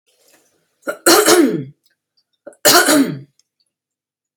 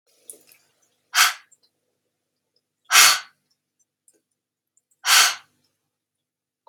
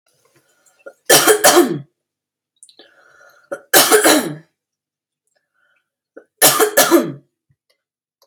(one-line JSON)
{"cough_length": "4.4 s", "cough_amplitude": 32768, "cough_signal_mean_std_ratio": 0.41, "exhalation_length": "6.7 s", "exhalation_amplitude": 32767, "exhalation_signal_mean_std_ratio": 0.25, "three_cough_length": "8.3 s", "three_cough_amplitude": 32768, "three_cough_signal_mean_std_ratio": 0.37, "survey_phase": "beta (2021-08-13 to 2022-03-07)", "age": "18-44", "gender": "Female", "wearing_mask": "No", "symptom_none": true, "symptom_onset": "11 days", "smoker_status": "Current smoker (e-cigarettes or vapes only)", "respiratory_condition_asthma": false, "respiratory_condition_other": false, "recruitment_source": "REACT", "submission_delay": "1 day", "covid_test_result": "Positive", "covid_test_method": "RT-qPCR", "covid_ct_value": 33.8, "covid_ct_gene": "E gene", "influenza_a_test_result": "Negative", "influenza_b_test_result": "Negative"}